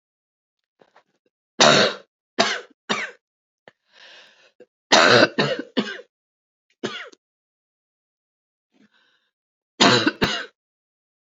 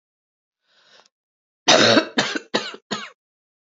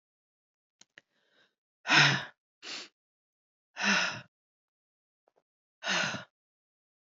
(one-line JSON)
{"three_cough_length": "11.3 s", "three_cough_amplitude": 31539, "three_cough_signal_mean_std_ratio": 0.3, "cough_length": "3.8 s", "cough_amplitude": 31568, "cough_signal_mean_std_ratio": 0.33, "exhalation_length": "7.1 s", "exhalation_amplitude": 12732, "exhalation_signal_mean_std_ratio": 0.29, "survey_phase": "beta (2021-08-13 to 2022-03-07)", "age": "18-44", "gender": "Female", "wearing_mask": "No", "symptom_cough_any": true, "symptom_new_continuous_cough": true, "symptom_runny_or_blocked_nose": true, "symptom_shortness_of_breath": true, "symptom_sore_throat": true, "symptom_fatigue": true, "symptom_headache": true, "symptom_onset": "3 days", "smoker_status": "Never smoked", "respiratory_condition_asthma": false, "respiratory_condition_other": false, "recruitment_source": "Test and Trace", "submission_delay": "2 days", "covid_test_result": "Positive", "covid_test_method": "RT-qPCR", "covid_ct_value": 25.5, "covid_ct_gene": "N gene"}